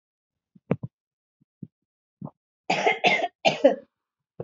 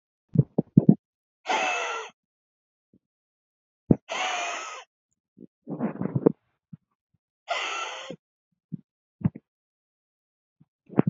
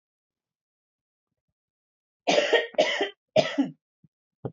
{"cough_length": "4.4 s", "cough_amplitude": 19284, "cough_signal_mean_std_ratio": 0.32, "exhalation_length": "11.1 s", "exhalation_amplitude": 26603, "exhalation_signal_mean_std_ratio": 0.27, "three_cough_length": "4.5 s", "three_cough_amplitude": 16177, "three_cough_signal_mean_std_ratio": 0.35, "survey_phase": "alpha (2021-03-01 to 2021-08-12)", "age": "45-64", "gender": "Female", "wearing_mask": "No", "symptom_none": true, "smoker_status": "Ex-smoker", "respiratory_condition_asthma": false, "respiratory_condition_other": false, "recruitment_source": "REACT", "submission_delay": "6 days", "covid_test_result": "Negative", "covid_test_method": "RT-qPCR"}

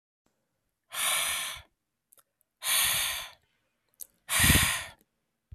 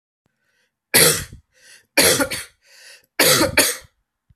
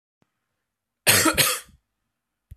{"exhalation_length": "5.5 s", "exhalation_amplitude": 14140, "exhalation_signal_mean_std_ratio": 0.44, "three_cough_length": "4.4 s", "three_cough_amplitude": 32768, "three_cough_signal_mean_std_ratio": 0.41, "cough_length": "2.6 s", "cough_amplitude": 28873, "cough_signal_mean_std_ratio": 0.34, "survey_phase": "alpha (2021-03-01 to 2021-08-12)", "age": "18-44", "gender": "Male", "wearing_mask": "No", "symptom_cough_any": true, "symptom_shortness_of_breath": true, "symptom_headache": true, "symptom_onset": "2 days", "smoker_status": "Never smoked", "respiratory_condition_asthma": false, "respiratory_condition_other": false, "recruitment_source": "Test and Trace", "submission_delay": "1 day", "covid_test_result": "Positive", "covid_test_method": "RT-qPCR"}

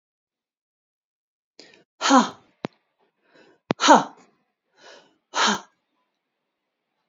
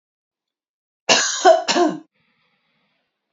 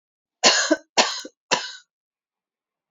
{"exhalation_length": "7.1 s", "exhalation_amplitude": 28753, "exhalation_signal_mean_std_ratio": 0.24, "cough_length": "3.3 s", "cough_amplitude": 28534, "cough_signal_mean_std_ratio": 0.36, "three_cough_length": "2.9 s", "three_cough_amplitude": 27844, "three_cough_signal_mean_std_ratio": 0.35, "survey_phase": "beta (2021-08-13 to 2022-03-07)", "age": "45-64", "gender": "Female", "wearing_mask": "No", "symptom_none": true, "smoker_status": "Never smoked", "respiratory_condition_asthma": false, "respiratory_condition_other": false, "recruitment_source": "REACT", "submission_delay": "1 day", "covid_test_result": "Negative", "covid_test_method": "RT-qPCR", "influenza_a_test_result": "Negative", "influenza_b_test_result": "Negative"}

